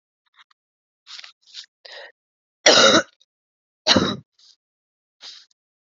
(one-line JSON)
{"cough_length": "5.8 s", "cough_amplitude": 32768, "cough_signal_mean_std_ratio": 0.27, "survey_phase": "alpha (2021-03-01 to 2021-08-12)", "age": "18-44", "gender": "Female", "wearing_mask": "Yes", "symptom_cough_any": true, "symptom_new_continuous_cough": true, "symptom_shortness_of_breath": true, "symptom_abdominal_pain": true, "symptom_fatigue": true, "symptom_fever_high_temperature": true, "symptom_headache": true, "symptom_change_to_sense_of_smell_or_taste": true, "symptom_loss_of_taste": true, "smoker_status": "Current smoker (1 to 10 cigarettes per day)", "respiratory_condition_asthma": false, "respiratory_condition_other": false, "recruitment_source": "Test and Trace", "submission_delay": "2 days", "covid_test_result": "Positive", "covid_test_method": "LFT"}